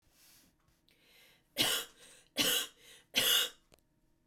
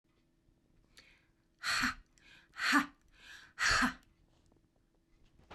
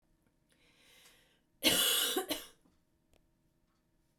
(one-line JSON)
{"three_cough_length": "4.3 s", "three_cough_amplitude": 5723, "three_cough_signal_mean_std_ratio": 0.39, "exhalation_length": "5.5 s", "exhalation_amplitude": 5232, "exhalation_signal_mean_std_ratio": 0.35, "cough_length": "4.2 s", "cough_amplitude": 6219, "cough_signal_mean_std_ratio": 0.34, "survey_phase": "beta (2021-08-13 to 2022-03-07)", "age": "45-64", "gender": "Female", "wearing_mask": "No", "symptom_none": true, "smoker_status": "Never smoked", "respiratory_condition_asthma": false, "respiratory_condition_other": false, "recruitment_source": "REACT", "submission_delay": "4 days", "covid_test_result": "Negative", "covid_test_method": "RT-qPCR", "influenza_a_test_result": "Negative", "influenza_b_test_result": "Negative"}